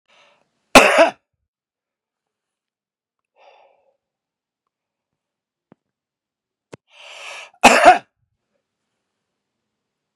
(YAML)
cough_length: 10.2 s
cough_amplitude: 32768
cough_signal_mean_std_ratio: 0.2
survey_phase: beta (2021-08-13 to 2022-03-07)
age: 65+
gender: Male
wearing_mask: 'No'
symptom_none: true
smoker_status: Never smoked
respiratory_condition_asthma: false
respiratory_condition_other: false
recruitment_source: REACT
submission_delay: 1 day
covid_test_result: Negative
covid_test_method: RT-qPCR
influenza_a_test_result: Negative
influenza_b_test_result: Negative